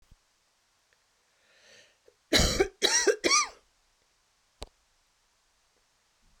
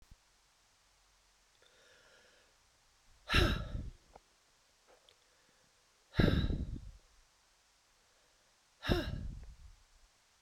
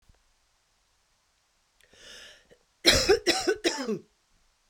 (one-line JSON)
{"three_cough_length": "6.4 s", "three_cough_amplitude": 11518, "three_cough_signal_mean_std_ratio": 0.3, "exhalation_length": "10.4 s", "exhalation_amplitude": 5582, "exhalation_signal_mean_std_ratio": 0.31, "cough_length": "4.7 s", "cough_amplitude": 24034, "cough_signal_mean_std_ratio": 0.33, "survey_phase": "beta (2021-08-13 to 2022-03-07)", "age": "45-64", "gender": "Female", "wearing_mask": "No", "symptom_cough_any": true, "symptom_runny_or_blocked_nose": true, "symptom_diarrhoea": true, "symptom_fatigue": true, "symptom_headache": true, "symptom_other": true, "smoker_status": "Ex-smoker", "respiratory_condition_asthma": true, "respiratory_condition_other": false, "recruitment_source": "Test and Trace", "submission_delay": "2 days", "covid_test_result": "Positive", "covid_test_method": "RT-qPCR", "covid_ct_value": 17.8, "covid_ct_gene": "ORF1ab gene", "covid_ct_mean": 18.3, "covid_viral_load": "1000000 copies/ml", "covid_viral_load_category": "High viral load (>1M copies/ml)"}